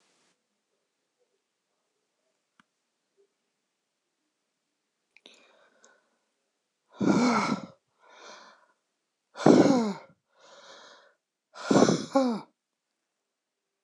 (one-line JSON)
{"exhalation_length": "13.8 s", "exhalation_amplitude": 22189, "exhalation_signal_mean_std_ratio": 0.27, "survey_phase": "beta (2021-08-13 to 2022-03-07)", "age": "65+", "gender": "Female", "wearing_mask": "No", "symptom_runny_or_blocked_nose": true, "smoker_status": "Ex-smoker", "respiratory_condition_asthma": false, "respiratory_condition_other": false, "recruitment_source": "REACT", "submission_delay": "11 days", "covid_test_result": "Negative", "covid_test_method": "RT-qPCR", "influenza_a_test_result": "Negative", "influenza_b_test_result": "Negative"}